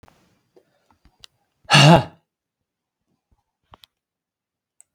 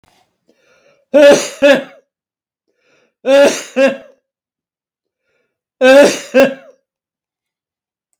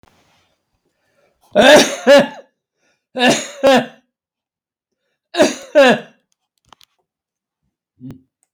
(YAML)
exhalation_length: 4.9 s
exhalation_amplitude: 32768
exhalation_signal_mean_std_ratio: 0.2
three_cough_length: 8.2 s
three_cough_amplitude: 32768
three_cough_signal_mean_std_ratio: 0.37
cough_length: 8.5 s
cough_amplitude: 32768
cough_signal_mean_std_ratio: 0.34
survey_phase: beta (2021-08-13 to 2022-03-07)
age: 65+
gender: Male
wearing_mask: 'No'
symptom_cough_any: true
symptom_runny_or_blocked_nose: true
symptom_shortness_of_breath: true
symptom_abdominal_pain: true
smoker_status: Ex-smoker
respiratory_condition_asthma: false
respiratory_condition_other: true
recruitment_source: REACT
submission_delay: 2 days
covid_test_result: Negative
covid_test_method: RT-qPCR